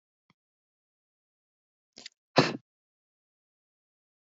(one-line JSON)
{"exhalation_length": "4.4 s", "exhalation_amplitude": 16781, "exhalation_signal_mean_std_ratio": 0.13, "survey_phase": "alpha (2021-03-01 to 2021-08-12)", "age": "18-44", "gender": "Male", "wearing_mask": "No", "symptom_new_continuous_cough": true, "symptom_fatigue": true, "symptom_headache": true, "symptom_onset": "2 days", "smoker_status": "Never smoked", "respiratory_condition_asthma": false, "respiratory_condition_other": false, "recruitment_source": "Test and Trace", "submission_delay": "1 day", "covid_test_result": "Positive", "covid_test_method": "RT-qPCR", "covid_ct_value": 28.1, "covid_ct_gene": "ORF1ab gene", "covid_ct_mean": 29.4, "covid_viral_load": "220 copies/ml", "covid_viral_load_category": "Minimal viral load (< 10K copies/ml)"}